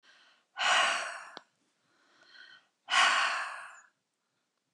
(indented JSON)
{
  "exhalation_length": "4.7 s",
  "exhalation_amplitude": 7396,
  "exhalation_signal_mean_std_ratio": 0.41,
  "survey_phase": "beta (2021-08-13 to 2022-03-07)",
  "age": "65+",
  "gender": "Female",
  "wearing_mask": "No",
  "symptom_cough_any": true,
  "symptom_runny_or_blocked_nose": true,
  "symptom_sore_throat": true,
  "symptom_diarrhoea": true,
  "symptom_fatigue": true,
  "symptom_headache": true,
  "symptom_other": true,
  "symptom_onset": "5 days",
  "smoker_status": "Never smoked",
  "respiratory_condition_asthma": false,
  "respiratory_condition_other": false,
  "recruitment_source": "Test and Trace",
  "submission_delay": "2 days",
  "covid_test_result": "Positive",
  "covid_test_method": "RT-qPCR",
  "covid_ct_value": 14.2,
  "covid_ct_gene": "N gene"
}